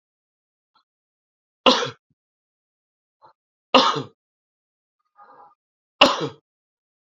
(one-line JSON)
{"three_cough_length": "7.1 s", "three_cough_amplitude": 29781, "three_cough_signal_mean_std_ratio": 0.22, "survey_phase": "alpha (2021-03-01 to 2021-08-12)", "age": "18-44", "gender": "Male", "wearing_mask": "No", "symptom_cough_any": true, "symptom_new_continuous_cough": true, "symptom_fatigue": true, "symptom_headache": true, "smoker_status": "Ex-smoker", "respiratory_condition_asthma": true, "respiratory_condition_other": false, "recruitment_source": "Test and Trace", "submission_delay": "1 day", "covid_test_result": "Positive", "covid_test_method": "RT-qPCR", "covid_ct_value": 19.1, "covid_ct_gene": "ORF1ab gene", "covid_ct_mean": 20.3, "covid_viral_load": "220000 copies/ml", "covid_viral_load_category": "Low viral load (10K-1M copies/ml)"}